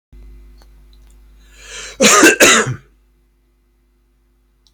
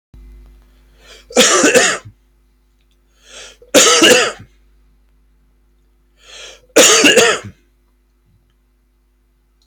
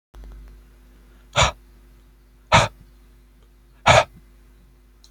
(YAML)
cough_length: 4.7 s
cough_amplitude: 32768
cough_signal_mean_std_ratio: 0.34
three_cough_length: 9.7 s
three_cough_amplitude: 32768
three_cough_signal_mean_std_ratio: 0.38
exhalation_length: 5.1 s
exhalation_amplitude: 30226
exhalation_signal_mean_std_ratio: 0.28
survey_phase: beta (2021-08-13 to 2022-03-07)
age: 18-44
gender: Male
wearing_mask: 'No'
symptom_none: true
smoker_status: Never smoked
respiratory_condition_asthma: false
respiratory_condition_other: false
recruitment_source: REACT
submission_delay: 0 days
covid_test_result: Negative
covid_test_method: RT-qPCR